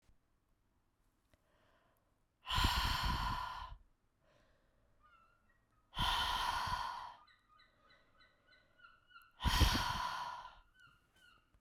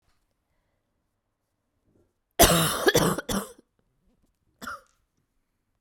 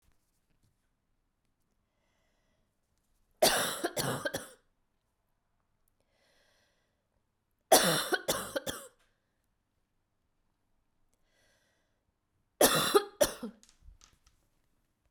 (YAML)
exhalation_length: 11.6 s
exhalation_amplitude: 4426
exhalation_signal_mean_std_ratio: 0.43
cough_length: 5.8 s
cough_amplitude: 28245
cough_signal_mean_std_ratio: 0.29
three_cough_length: 15.1 s
three_cough_amplitude: 13086
three_cough_signal_mean_std_ratio: 0.26
survey_phase: beta (2021-08-13 to 2022-03-07)
age: 18-44
gender: Female
wearing_mask: 'No'
symptom_cough_any: true
symptom_new_continuous_cough: true
symptom_shortness_of_breath: true
symptom_sore_throat: true
symptom_fever_high_temperature: true
symptom_headache: true
smoker_status: Never smoked
respiratory_condition_asthma: false
respiratory_condition_other: false
recruitment_source: Test and Trace
submission_delay: 1 day
covid_test_result: Positive
covid_test_method: RT-qPCR
covid_ct_value: 28.8
covid_ct_gene: N gene
covid_ct_mean: 29.0
covid_viral_load: 300 copies/ml
covid_viral_load_category: Minimal viral load (< 10K copies/ml)